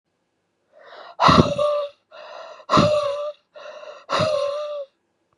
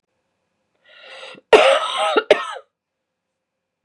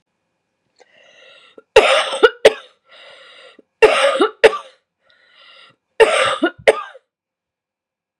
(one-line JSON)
{"exhalation_length": "5.4 s", "exhalation_amplitude": 32763, "exhalation_signal_mean_std_ratio": 0.5, "cough_length": "3.8 s", "cough_amplitude": 32768, "cough_signal_mean_std_ratio": 0.33, "three_cough_length": "8.2 s", "three_cough_amplitude": 32768, "three_cough_signal_mean_std_ratio": 0.33, "survey_phase": "beta (2021-08-13 to 2022-03-07)", "age": "18-44", "gender": "Female", "wearing_mask": "No", "symptom_cough_any": true, "symptom_runny_or_blocked_nose": true, "symptom_shortness_of_breath": true, "symptom_sore_throat": true, "symptom_onset": "4 days", "smoker_status": "Never smoked", "respiratory_condition_asthma": false, "respiratory_condition_other": false, "recruitment_source": "Test and Trace", "submission_delay": "1 day", "covid_test_result": "Positive", "covid_test_method": "RT-qPCR", "covid_ct_value": 20.4, "covid_ct_gene": "N gene"}